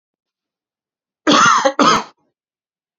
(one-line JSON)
{"cough_length": "3.0 s", "cough_amplitude": 32686, "cough_signal_mean_std_ratio": 0.4, "survey_phase": "beta (2021-08-13 to 2022-03-07)", "age": "18-44", "gender": "Male", "wearing_mask": "No", "symptom_none": true, "smoker_status": "Never smoked", "respiratory_condition_asthma": false, "respiratory_condition_other": false, "recruitment_source": "REACT", "submission_delay": "1 day", "covid_test_result": "Negative", "covid_test_method": "RT-qPCR"}